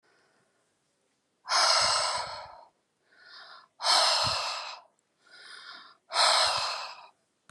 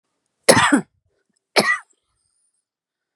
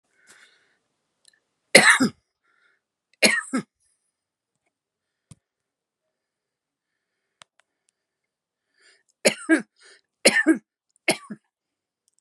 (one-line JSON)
{"exhalation_length": "7.5 s", "exhalation_amplitude": 12337, "exhalation_signal_mean_std_ratio": 0.48, "cough_length": "3.2 s", "cough_amplitude": 32768, "cough_signal_mean_std_ratio": 0.3, "three_cough_length": "12.2 s", "three_cough_amplitude": 32768, "three_cough_signal_mean_std_ratio": 0.22, "survey_phase": "beta (2021-08-13 to 2022-03-07)", "age": "65+", "gender": "Female", "wearing_mask": "No", "symptom_abdominal_pain": true, "smoker_status": "Ex-smoker", "respiratory_condition_asthma": false, "respiratory_condition_other": false, "recruitment_source": "REACT", "submission_delay": "1 day", "covid_test_result": "Negative", "covid_test_method": "RT-qPCR"}